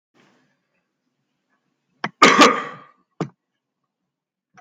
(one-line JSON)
{"cough_length": "4.6 s", "cough_amplitude": 32768, "cough_signal_mean_std_ratio": 0.23, "survey_phase": "beta (2021-08-13 to 2022-03-07)", "age": "45-64", "gender": "Male", "wearing_mask": "No", "symptom_none": true, "smoker_status": "Ex-smoker", "respiratory_condition_asthma": false, "respiratory_condition_other": false, "recruitment_source": "REACT", "submission_delay": "1 day", "covid_test_result": "Negative", "covid_test_method": "RT-qPCR"}